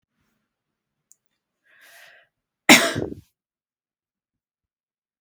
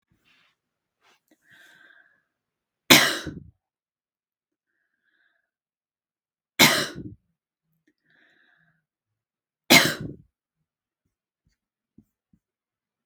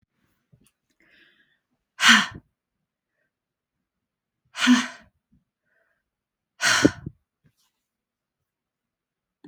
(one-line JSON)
{"cough_length": "5.2 s", "cough_amplitude": 32768, "cough_signal_mean_std_ratio": 0.16, "three_cough_length": "13.1 s", "three_cough_amplitude": 32768, "three_cough_signal_mean_std_ratio": 0.18, "exhalation_length": "9.5 s", "exhalation_amplitude": 32217, "exhalation_signal_mean_std_ratio": 0.22, "survey_phase": "beta (2021-08-13 to 2022-03-07)", "age": "45-64", "gender": "Female", "wearing_mask": "No", "symptom_none": true, "smoker_status": "Ex-smoker", "respiratory_condition_asthma": false, "respiratory_condition_other": false, "recruitment_source": "REACT", "submission_delay": "1 day", "covid_test_result": "Negative", "covid_test_method": "RT-qPCR"}